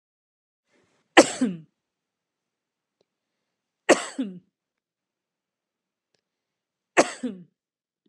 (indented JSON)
{
  "three_cough_length": "8.1 s",
  "three_cough_amplitude": 32673,
  "three_cough_signal_mean_std_ratio": 0.18,
  "survey_phase": "beta (2021-08-13 to 2022-03-07)",
  "age": "45-64",
  "gender": "Female",
  "wearing_mask": "No",
  "symptom_none": true,
  "symptom_onset": "11 days",
  "smoker_status": "Never smoked",
  "respiratory_condition_asthma": false,
  "respiratory_condition_other": false,
  "recruitment_source": "REACT",
  "submission_delay": "6 days",
  "covid_test_result": "Negative",
  "covid_test_method": "RT-qPCR",
  "influenza_a_test_result": "Negative",
  "influenza_b_test_result": "Negative"
}